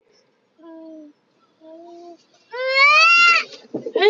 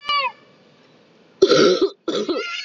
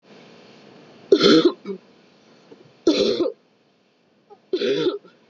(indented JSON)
{
  "exhalation_length": "4.1 s",
  "exhalation_amplitude": 22753,
  "exhalation_signal_mean_std_ratio": 0.46,
  "cough_length": "2.6 s",
  "cough_amplitude": 28057,
  "cough_signal_mean_std_ratio": 0.53,
  "three_cough_length": "5.3 s",
  "three_cough_amplitude": 26036,
  "three_cough_signal_mean_std_ratio": 0.4,
  "survey_phase": "beta (2021-08-13 to 2022-03-07)",
  "age": "18-44",
  "gender": "Female",
  "wearing_mask": "No",
  "symptom_cough_any": true,
  "symptom_runny_or_blocked_nose": true,
  "symptom_sore_throat": true,
  "symptom_fever_high_temperature": true,
  "symptom_headache": true,
  "symptom_change_to_sense_of_smell_or_taste": true,
  "symptom_onset": "3 days",
  "smoker_status": "Never smoked",
  "respiratory_condition_asthma": false,
  "respiratory_condition_other": false,
  "recruitment_source": "Test and Trace",
  "submission_delay": "1 day",
  "covid_test_result": "Positive",
  "covid_test_method": "RT-qPCR"
}